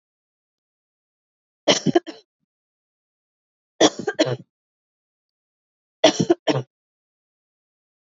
{"three_cough_length": "8.2 s", "three_cough_amplitude": 29564, "three_cough_signal_mean_std_ratio": 0.24, "survey_phase": "alpha (2021-03-01 to 2021-08-12)", "age": "18-44", "gender": "Female", "wearing_mask": "No", "symptom_cough_any": true, "symptom_shortness_of_breath": true, "symptom_fatigue": true, "symptom_headache": true, "symptom_loss_of_taste": true, "smoker_status": "Never smoked", "respiratory_condition_asthma": false, "respiratory_condition_other": false, "recruitment_source": "Test and Trace", "submission_delay": "2 days", "covid_test_result": "Positive", "covid_test_method": "ePCR"}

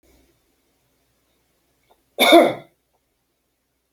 {"cough_length": "3.9 s", "cough_amplitude": 32766, "cough_signal_mean_std_ratio": 0.23, "survey_phase": "beta (2021-08-13 to 2022-03-07)", "age": "45-64", "gender": "Male", "wearing_mask": "No", "symptom_none": true, "smoker_status": "Never smoked", "respiratory_condition_asthma": false, "respiratory_condition_other": false, "recruitment_source": "REACT", "submission_delay": "1 day", "covid_test_result": "Negative", "covid_test_method": "RT-qPCR"}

